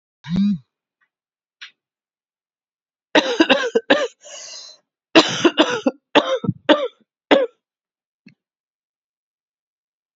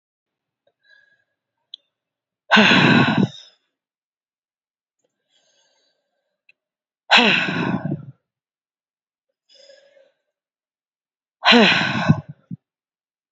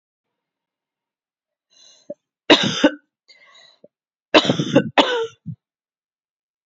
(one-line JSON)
{"cough_length": "10.2 s", "cough_amplitude": 31890, "cough_signal_mean_std_ratio": 0.34, "exhalation_length": "13.3 s", "exhalation_amplitude": 32506, "exhalation_signal_mean_std_ratio": 0.31, "three_cough_length": "6.7 s", "three_cough_amplitude": 31747, "three_cough_signal_mean_std_ratio": 0.29, "survey_phase": "alpha (2021-03-01 to 2021-08-12)", "age": "18-44", "gender": "Female", "wearing_mask": "No", "symptom_cough_any": true, "symptom_new_continuous_cough": true, "symptom_fatigue": true, "symptom_fever_high_temperature": true, "symptom_headache": true, "symptom_onset": "3 days", "smoker_status": "Never smoked", "respiratory_condition_asthma": false, "respiratory_condition_other": false, "recruitment_source": "Test and Trace", "submission_delay": "1 day", "covid_test_result": "Positive", "covid_test_method": "RT-qPCR", "covid_ct_value": 21.2, "covid_ct_gene": "ORF1ab gene", "covid_ct_mean": 21.3, "covid_viral_load": "100000 copies/ml", "covid_viral_load_category": "Low viral load (10K-1M copies/ml)"}